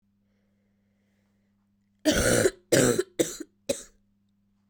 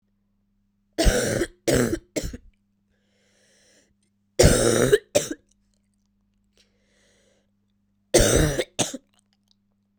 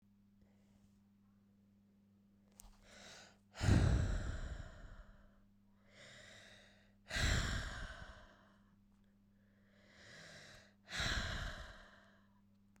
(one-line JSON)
{"cough_length": "4.7 s", "cough_amplitude": 17228, "cough_signal_mean_std_ratio": 0.35, "three_cough_length": "10.0 s", "three_cough_amplitude": 30281, "three_cough_signal_mean_std_ratio": 0.35, "exhalation_length": "12.8 s", "exhalation_amplitude": 3584, "exhalation_signal_mean_std_ratio": 0.39, "survey_phase": "beta (2021-08-13 to 2022-03-07)", "age": "18-44", "gender": "Female", "wearing_mask": "No", "symptom_runny_or_blocked_nose": true, "symptom_fatigue": true, "symptom_headache": true, "symptom_loss_of_taste": true, "symptom_onset": "2 days", "smoker_status": "Ex-smoker", "respiratory_condition_asthma": false, "respiratory_condition_other": false, "recruitment_source": "Test and Trace", "submission_delay": "2 days", "covid_test_result": "Positive", "covid_test_method": "RT-qPCR", "covid_ct_value": 13.0, "covid_ct_gene": "ORF1ab gene", "covid_ct_mean": 13.6, "covid_viral_load": "35000000 copies/ml", "covid_viral_load_category": "High viral load (>1M copies/ml)"}